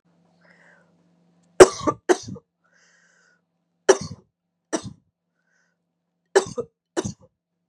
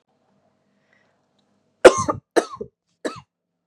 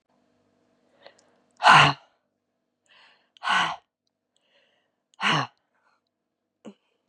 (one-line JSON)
{"three_cough_length": "7.7 s", "three_cough_amplitude": 32768, "three_cough_signal_mean_std_ratio": 0.18, "cough_length": "3.7 s", "cough_amplitude": 32768, "cough_signal_mean_std_ratio": 0.19, "exhalation_length": "7.1 s", "exhalation_amplitude": 25413, "exhalation_signal_mean_std_ratio": 0.24, "survey_phase": "beta (2021-08-13 to 2022-03-07)", "age": "18-44", "gender": "Female", "wearing_mask": "No", "symptom_cough_any": true, "symptom_runny_or_blocked_nose": true, "smoker_status": "Never smoked", "respiratory_condition_asthma": false, "respiratory_condition_other": false, "recruitment_source": "Test and Trace", "submission_delay": "2 days", "covid_test_result": "Positive", "covid_test_method": "LFT"}